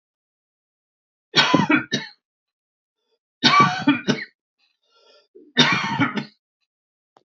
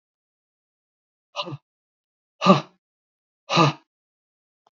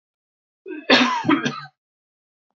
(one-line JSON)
{"three_cough_length": "7.3 s", "three_cough_amplitude": 28836, "three_cough_signal_mean_std_ratio": 0.38, "exhalation_length": "4.8 s", "exhalation_amplitude": 23533, "exhalation_signal_mean_std_ratio": 0.23, "cough_length": "2.6 s", "cough_amplitude": 31231, "cough_signal_mean_std_ratio": 0.39, "survey_phase": "alpha (2021-03-01 to 2021-08-12)", "age": "45-64", "gender": "Male", "wearing_mask": "No", "symptom_fatigue": true, "symptom_onset": "13 days", "smoker_status": "Ex-smoker", "respiratory_condition_asthma": false, "respiratory_condition_other": false, "recruitment_source": "REACT", "submission_delay": "2 days", "covid_test_result": "Negative", "covid_test_method": "RT-qPCR"}